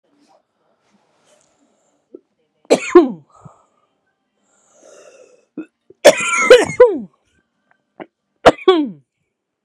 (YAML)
three_cough_length: 9.6 s
three_cough_amplitude: 32768
three_cough_signal_mean_std_ratio: 0.27
survey_phase: beta (2021-08-13 to 2022-03-07)
age: 18-44
gender: Female
wearing_mask: 'No'
symptom_cough_any: true
symptom_runny_or_blocked_nose: true
symptom_shortness_of_breath: true
symptom_sore_throat: true
symptom_diarrhoea: true
symptom_fatigue: true
symptom_fever_high_temperature: true
symptom_headache: true
symptom_onset: 2 days
smoker_status: Current smoker (e-cigarettes or vapes only)
respiratory_condition_asthma: true
respiratory_condition_other: true
recruitment_source: Test and Trace
submission_delay: 2 days
covid_test_result: Positive
covid_test_method: RT-qPCR
covid_ct_value: 20.1
covid_ct_gene: N gene